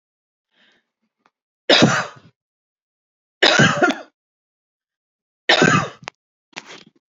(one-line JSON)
{"three_cough_length": "7.2 s", "three_cough_amplitude": 31409, "three_cough_signal_mean_std_ratio": 0.32, "survey_phase": "beta (2021-08-13 to 2022-03-07)", "age": "45-64", "gender": "Female", "wearing_mask": "No", "symptom_cough_any": true, "smoker_status": "Never smoked", "respiratory_condition_asthma": false, "respiratory_condition_other": false, "recruitment_source": "REACT", "submission_delay": "2 days", "covid_test_result": "Negative", "covid_test_method": "RT-qPCR"}